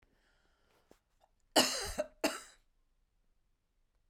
{"cough_length": "4.1 s", "cough_amplitude": 7699, "cough_signal_mean_std_ratio": 0.26, "survey_phase": "beta (2021-08-13 to 2022-03-07)", "age": "65+", "gender": "Female", "wearing_mask": "No", "symptom_none": true, "smoker_status": "Ex-smoker", "respiratory_condition_asthma": false, "respiratory_condition_other": false, "recruitment_source": "REACT", "submission_delay": "3 days", "covid_test_result": "Negative", "covid_test_method": "RT-qPCR"}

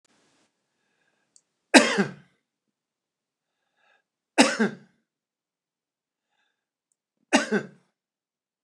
{"three_cough_length": "8.6 s", "three_cough_amplitude": 29203, "three_cough_signal_mean_std_ratio": 0.21, "survey_phase": "beta (2021-08-13 to 2022-03-07)", "age": "65+", "gender": "Male", "wearing_mask": "No", "symptom_none": true, "smoker_status": "Never smoked", "respiratory_condition_asthma": false, "respiratory_condition_other": false, "recruitment_source": "REACT", "submission_delay": "1 day", "covid_test_result": "Negative", "covid_test_method": "RT-qPCR"}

